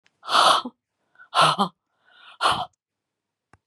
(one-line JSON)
{"exhalation_length": "3.7 s", "exhalation_amplitude": 19221, "exhalation_signal_mean_std_ratio": 0.38, "survey_phase": "beta (2021-08-13 to 2022-03-07)", "age": "65+", "gender": "Female", "wearing_mask": "No", "symptom_cough_any": true, "symptom_sore_throat": true, "smoker_status": "Never smoked", "respiratory_condition_asthma": true, "respiratory_condition_other": false, "recruitment_source": "Test and Trace", "submission_delay": "2 days", "covid_test_result": "Positive", "covid_test_method": "RT-qPCR", "covid_ct_value": 17.2, "covid_ct_gene": "ORF1ab gene", "covid_ct_mean": 17.4, "covid_viral_load": "2000000 copies/ml", "covid_viral_load_category": "High viral load (>1M copies/ml)"}